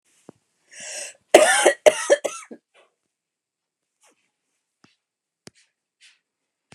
{"cough_length": "6.7 s", "cough_amplitude": 29204, "cough_signal_mean_std_ratio": 0.23, "survey_phase": "beta (2021-08-13 to 2022-03-07)", "age": "65+", "gender": "Female", "wearing_mask": "No", "symptom_cough_any": true, "smoker_status": "Never smoked", "respiratory_condition_asthma": false, "respiratory_condition_other": false, "recruitment_source": "REACT", "submission_delay": "1 day", "covid_test_result": "Negative", "covid_test_method": "RT-qPCR", "influenza_a_test_result": "Unknown/Void", "influenza_b_test_result": "Unknown/Void"}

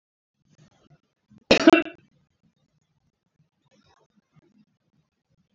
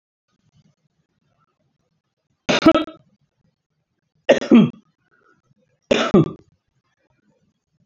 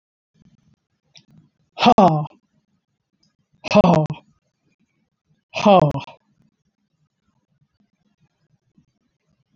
{"cough_length": "5.5 s", "cough_amplitude": 27347, "cough_signal_mean_std_ratio": 0.16, "three_cough_length": "7.9 s", "three_cough_amplitude": 27643, "three_cough_signal_mean_std_ratio": 0.25, "exhalation_length": "9.6 s", "exhalation_amplitude": 27098, "exhalation_signal_mean_std_ratio": 0.26, "survey_phase": "beta (2021-08-13 to 2022-03-07)", "age": "45-64", "gender": "Female", "wearing_mask": "No", "symptom_none": true, "smoker_status": "Ex-smoker", "respiratory_condition_asthma": false, "respiratory_condition_other": false, "recruitment_source": "REACT", "submission_delay": "1 day", "covid_test_result": "Negative", "covid_test_method": "RT-qPCR"}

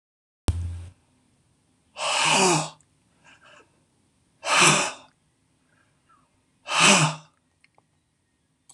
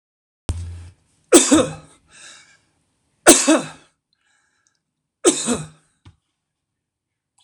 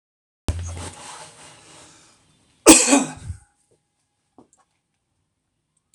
{"exhalation_length": "8.7 s", "exhalation_amplitude": 23189, "exhalation_signal_mean_std_ratio": 0.36, "three_cough_length": "7.4 s", "three_cough_amplitude": 26028, "three_cough_signal_mean_std_ratio": 0.29, "cough_length": "5.9 s", "cough_amplitude": 26028, "cough_signal_mean_std_ratio": 0.24, "survey_phase": "beta (2021-08-13 to 2022-03-07)", "age": "65+", "gender": "Male", "wearing_mask": "No", "symptom_none": true, "smoker_status": "Current smoker (e-cigarettes or vapes only)", "respiratory_condition_asthma": false, "respiratory_condition_other": false, "recruitment_source": "REACT", "submission_delay": "4 days", "covid_test_result": "Negative", "covid_test_method": "RT-qPCR", "influenza_a_test_result": "Unknown/Void", "influenza_b_test_result": "Unknown/Void"}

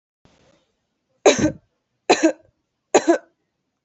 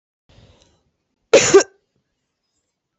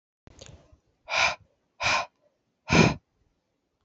{"three_cough_length": "3.8 s", "three_cough_amplitude": 28674, "three_cough_signal_mean_std_ratio": 0.3, "cough_length": "3.0 s", "cough_amplitude": 28998, "cough_signal_mean_std_ratio": 0.24, "exhalation_length": "3.8 s", "exhalation_amplitude": 19280, "exhalation_signal_mean_std_ratio": 0.33, "survey_phase": "alpha (2021-03-01 to 2021-08-12)", "age": "18-44", "gender": "Female", "wearing_mask": "No", "symptom_cough_any": true, "symptom_fatigue": true, "symptom_headache": true, "symptom_change_to_sense_of_smell_or_taste": true, "symptom_onset": "3 days", "smoker_status": "Current smoker (1 to 10 cigarettes per day)", "respiratory_condition_asthma": false, "respiratory_condition_other": false, "recruitment_source": "Test and Trace", "submission_delay": "2 days", "covid_test_result": "Positive", "covid_test_method": "RT-qPCR", "covid_ct_value": 27.0, "covid_ct_gene": "N gene"}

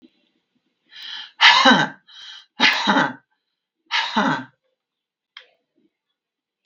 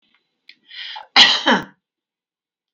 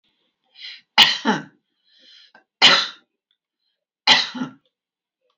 {"exhalation_length": "6.7 s", "exhalation_amplitude": 32768, "exhalation_signal_mean_std_ratio": 0.36, "cough_length": "2.7 s", "cough_amplitude": 32768, "cough_signal_mean_std_ratio": 0.31, "three_cough_length": "5.4 s", "three_cough_amplitude": 32768, "three_cough_signal_mean_std_ratio": 0.3, "survey_phase": "beta (2021-08-13 to 2022-03-07)", "age": "65+", "gender": "Female", "wearing_mask": "No", "symptom_runny_or_blocked_nose": true, "symptom_abdominal_pain": true, "symptom_diarrhoea": true, "symptom_fatigue": true, "symptom_onset": "12 days", "smoker_status": "Ex-smoker", "respiratory_condition_asthma": false, "respiratory_condition_other": true, "recruitment_source": "REACT", "submission_delay": "3 days", "covid_test_result": "Negative", "covid_test_method": "RT-qPCR", "influenza_a_test_result": "Negative", "influenza_b_test_result": "Negative"}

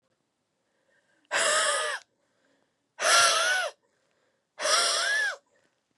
{"exhalation_length": "6.0 s", "exhalation_amplitude": 12233, "exhalation_signal_mean_std_ratio": 0.51, "survey_phase": "beta (2021-08-13 to 2022-03-07)", "age": "45-64", "gender": "Female", "wearing_mask": "No", "symptom_cough_any": true, "symptom_runny_or_blocked_nose": true, "symptom_fatigue": true, "symptom_headache": true, "symptom_onset": "3 days", "smoker_status": "Never smoked", "respiratory_condition_asthma": false, "respiratory_condition_other": false, "recruitment_source": "Test and Trace", "submission_delay": "2 days", "covid_test_result": "Positive", "covid_test_method": "RT-qPCR", "covid_ct_value": 16.0, "covid_ct_gene": "ORF1ab gene", "covid_ct_mean": 16.9, "covid_viral_load": "2900000 copies/ml", "covid_viral_load_category": "High viral load (>1M copies/ml)"}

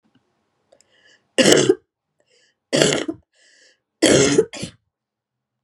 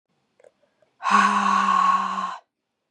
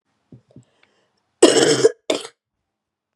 {"three_cough_length": "5.6 s", "three_cough_amplitude": 32768, "three_cough_signal_mean_std_ratio": 0.35, "exhalation_length": "2.9 s", "exhalation_amplitude": 16496, "exhalation_signal_mean_std_ratio": 0.59, "cough_length": "3.2 s", "cough_amplitude": 32768, "cough_signal_mean_std_ratio": 0.31, "survey_phase": "beta (2021-08-13 to 2022-03-07)", "age": "18-44", "gender": "Female", "wearing_mask": "No", "symptom_none": true, "smoker_status": "Never smoked", "respiratory_condition_asthma": false, "respiratory_condition_other": false, "recruitment_source": "Test and Trace", "submission_delay": "0 days", "covid_test_result": "Negative", "covid_test_method": "RT-qPCR"}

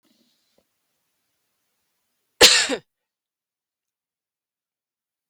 {"cough_length": "5.3 s", "cough_amplitude": 32768, "cough_signal_mean_std_ratio": 0.17, "survey_phase": "beta (2021-08-13 to 2022-03-07)", "age": "45-64", "gender": "Female", "wearing_mask": "No", "symptom_runny_or_blocked_nose": true, "symptom_fatigue": true, "symptom_onset": "11 days", "smoker_status": "Never smoked", "respiratory_condition_asthma": true, "respiratory_condition_other": false, "recruitment_source": "REACT", "submission_delay": "5 days", "covid_test_result": "Negative", "covid_test_method": "RT-qPCR", "influenza_a_test_result": "Negative", "influenza_b_test_result": "Negative"}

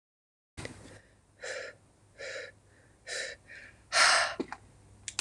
{"exhalation_length": "5.2 s", "exhalation_amplitude": 11081, "exhalation_signal_mean_std_ratio": 0.35, "survey_phase": "beta (2021-08-13 to 2022-03-07)", "age": "45-64", "gender": "Female", "wearing_mask": "No", "symptom_none": true, "smoker_status": "Ex-smoker", "respiratory_condition_asthma": false, "respiratory_condition_other": false, "recruitment_source": "REACT", "submission_delay": "3 days", "covid_test_result": "Negative", "covid_test_method": "RT-qPCR", "influenza_a_test_result": "Unknown/Void", "influenza_b_test_result": "Unknown/Void"}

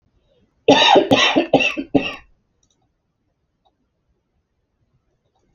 {"cough_length": "5.5 s", "cough_amplitude": 31391, "cough_signal_mean_std_ratio": 0.34, "survey_phase": "beta (2021-08-13 to 2022-03-07)", "age": "18-44", "gender": "Female", "wearing_mask": "No", "symptom_none": true, "symptom_onset": "4 days", "smoker_status": "Ex-smoker", "respiratory_condition_asthma": false, "respiratory_condition_other": false, "recruitment_source": "REACT", "submission_delay": "11 days", "covid_test_result": "Negative", "covid_test_method": "RT-qPCR"}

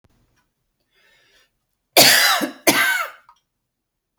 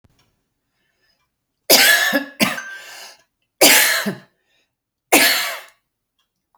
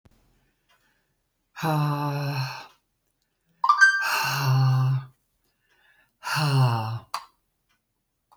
{"cough_length": "4.2 s", "cough_amplitude": 32768, "cough_signal_mean_std_ratio": 0.36, "three_cough_length": "6.6 s", "three_cough_amplitude": 32768, "three_cough_signal_mean_std_ratio": 0.39, "exhalation_length": "8.4 s", "exhalation_amplitude": 17307, "exhalation_signal_mean_std_ratio": 0.52, "survey_phase": "beta (2021-08-13 to 2022-03-07)", "age": "65+", "gender": "Female", "wearing_mask": "No", "symptom_headache": true, "symptom_onset": "3 days", "smoker_status": "Never smoked", "respiratory_condition_asthma": false, "respiratory_condition_other": false, "recruitment_source": "Test and Trace", "submission_delay": "1 day", "covid_test_result": "Negative", "covid_test_method": "RT-qPCR"}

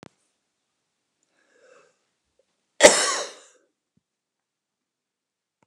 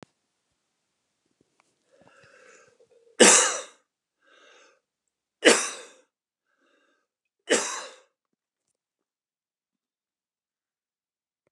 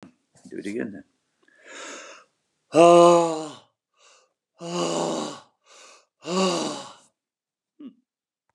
{"cough_length": "5.7 s", "cough_amplitude": 32768, "cough_signal_mean_std_ratio": 0.17, "three_cough_length": "11.5 s", "three_cough_amplitude": 26574, "three_cough_signal_mean_std_ratio": 0.19, "exhalation_length": "8.5 s", "exhalation_amplitude": 23938, "exhalation_signal_mean_std_ratio": 0.33, "survey_phase": "beta (2021-08-13 to 2022-03-07)", "age": "65+", "gender": "Male", "wearing_mask": "No", "symptom_none": true, "smoker_status": "Ex-smoker", "respiratory_condition_asthma": false, "respiratory_condition_other": false, "recruitment_source": "REACT", "submission_delay": "2 days", "covid_test_result": "Negative", "covid_test_method": "RT-qPCR"}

